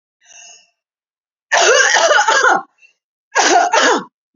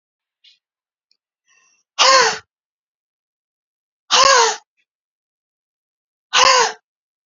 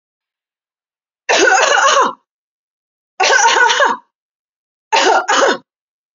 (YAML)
cough_length: 4.4 s
cough_amplitude: 32095
cough_signal_mean_std_ratio: 0.57
exhalation_length: 7.3 s
exhalation_amplitude: 32768
exhalation_signal_mean_std_ratio: 0.32
three_cough_length: 6.1 s
three_cough_amplitude: 32768
three_cough_signal_mean_std_ratio: 0.53
survey_phase: alpha (2021-03-01 to 2021-08-12)
age: 45-64
gender: Female
wearing_mask: 'No'
symptom_none: true
smoker_status: Never smoked
respiratory_condition_asthma: false
respiratory_condition_other: false
recruitment_source: REACT
submission_delay: 1 day
covid_test_result: Negative
covid_test_method: RT-qPCR